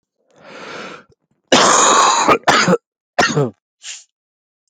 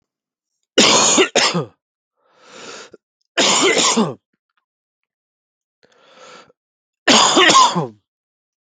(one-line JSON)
{"cough_length": "4.7 s", "cough_amplitude": 32768, "cough_signal_mean_std_ratio": 0.5, "three_cough_length": "8.7 s", "three_cough_amplitude": 32768, "three_cough_signal_mean_std_ratio": 0.43, "survey_phase": "beta (2021-08-13 to 2022-03-07)", "age": "18-44", "gender": "Male", "wearing_mask": "No", "symptom_cough_any": true, "symptom_runny_or_blocked_nose": true, "symptom_fatigue": true, "symptom_change_to_sense_of_smell_or_taste": true, "symptom_loss_of_taste": true, "symptom_onset": "4 days", "smoker_status": "Current smoker (1 to 10 cigarettes per day)", "respiratory_condition_asthma": false, "respiratory_condition_other": false, "recruitment_source": "Test and Trace", "submission_delay": "1 day", "covid_test_result": "Positive", "covid_test_method": "ePCR"}